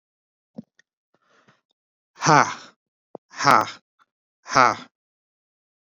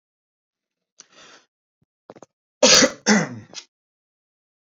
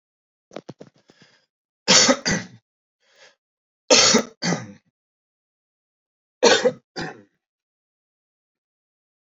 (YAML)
exhalation_length: 5.8 s
exhalation_amplitude: 28447
exhalation_signal_mean_std_ratio: 0.24
cough_length: 4.7 s
cough_amplitude: 32768
cough_signal_mean_std_ratio: 0.26
three_cough_length: 9.3 s
three_cough_amplitude: 32370
three_cough_signal_mean_std_ratio: 0.29
survey_phase: beta (2021-08-13 to 2022-03-07)
age: 65+
gender: Male
wearing_mask: 'No'
symptom_none: true
smoker_status: Ex-smoker
respiratory_condition_asthma: false
respiratory_condition_other: false
recruitment_source: REACT
submission_delay: 1 day
covid_test_result: Negative
covid_test_method: RT-qPCR